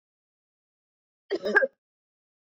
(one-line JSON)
{"cough_length": "2.6 s", "cough_amplitude": 13368, "cough_signal_mean_std_ratio": 0.24, "survey_phase": "beta (2021-08-13 to 2022-03-07)", "age": "45-64", "gender": "Female", "wearing_mask": "No", "symptom_none": true, "smoker_status": "Never smoked", "respiratory_condition_asthma": false, "respiratory_condition_other": false, "recruitment_source": "REACT", "submission_delay": "1 day", "covid_test_result": "Negative", "covid_test_method": "RT-qPCR", "influenza_a_test_result": "Negative", "influenza_b_test_result": "Negative"}